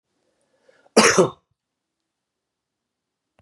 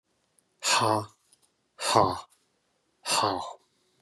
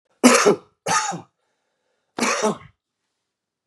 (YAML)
cough_length: 3.4 s
cough_amplitude: 31354
cough_signal_mean_std_ratio: 0.23
exhalation_length: 4.0 s
exhalation_amplitude: 17495
exhalation_signal_mean_std_ratio: 0.41
three_cough_length: 3.7 s
three_cough_amplitude: 32761
three_cough_signal_mean_std_ratio: 0.38
survey_phase: beta (2021-08-13 to 2022-03-07)
age: 45-64
gender: Male
wearing_mask: 'No'
symptom_cough_any: true
symptom_runny_or_blocked_nose: true
symptom_sore_throat: true
symptom_fatigue: true
symptom_headache: true
smoker_status: Never smoked
respiratory_condition_asthma: false
respiratory_condition_other: false
recruitment_source: Test and Trace
submission_delay: 1 day
covid_test_result: Positive
covid_test_method: RT-qPCR
covid_ct_value: 16.4
covid_ct_gene: ORF1ab gene
covid_ct_mean: 16.6
covid_viral_load: 3600000 copies/ml
covid_viral_load_category: High viral load (>1M copies/ml)